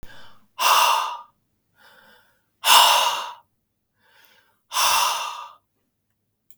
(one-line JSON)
{"exhalation_length": "6.6 s", "exhalation_amplitude": 32768, "exhalation_signal_mean_std_ratio": 0.42, "survey_phase": "beta (2021-08-13 to 2022-03-07)", "age": "45-64", "gender": "Male", "wearing_mask": "No", "symptom_cough_any": true, "symptom_sore_throat": true, "smoker_status": "Never smoked", "respiratory_condition_asthma": false, "respiratory_condition_other": false, "recruitment_source": "Test and Trace", "submission_delay": "1 day", "covid_test_result": "Positive", "covid_test_method": "RT-qPCR", "covid_ct_value": 19.3, "covid_ct_gene": "N gene"}